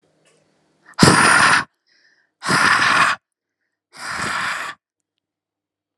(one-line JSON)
{"exhalation_length": "6.0 s", "exhalation_amplitude": 32768, "exhalation_signal_mean_std_ratio": 0.44, "survey_phase": "alpha (2021-03-01 to 2021-08-12)", "age": "18-44", "gender": "Female", "wearing_mask": "No", "symptom_cough_any": true, "smoker_status": "Never smoked", "respiratory_condition_asthma": false, "respiratory_condition_other": false, "recruitment_source": "REACT", "submission_delay": "2 days", "covid_test_result": "Negative", "covid_test_method": "RT-qPCR"}